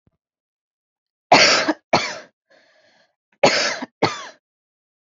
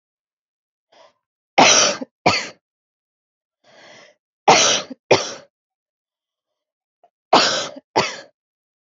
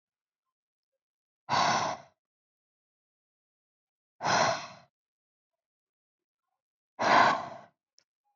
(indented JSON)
{
  "cough_length": "5.1 s",
  "cough_amplitude": 31486,
  "cough_signal_mean_std_ratio": 0.34,
  "three_cough_length": "8.9 s",
  "three_cough_amplitude": 31238,
  "three_cough_signal_mean_std_ratio": 0.32,
  "exhalation_length": "8.4 s",
  "exhalation_amplitude": 11971,
  "exhalation_signal_mean_std_ratio": 0.31,
  "survey_phase": "beta (2021-08-13 to 2022-03-07)",
  "age": "18-44",
  "gender": "Female",
  "wearing_mask": "No",
  "symptom_none": true,
  "smoker_status": "Ex-smoker",
  "respiratory_condition_asthma": false,
  "respiratory_condition_other": false,
  "recruitment_source": "REACT",
  "submission_delay": "2 days",
  "covid_test_result": "Negative",
  "covid_test_method": "RT-qPCR"
}